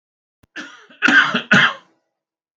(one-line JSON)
{"cough_length": "2.6 s", "cough_amplitude": 28715, "cough_signal_mean_std_ratio": 0.39, "survey_phase": "beta (2021-08-13 to 2022-03-07)", "age": "65+", "gender": "Male", "wearing_mask": "No", "symptom_none": true, "smoker_status": "Never smoked", "respiratory_condition_asthma": false, "respiratory_condition_other": false, "recruitment_source": "REACT", "submission_delay": "3 days", "covid_test_result": "Negative", "covid_test_method": "RT-qPCR", "influenza_a_test_result": "Negative", "influenza_b_test_result": "Negative"}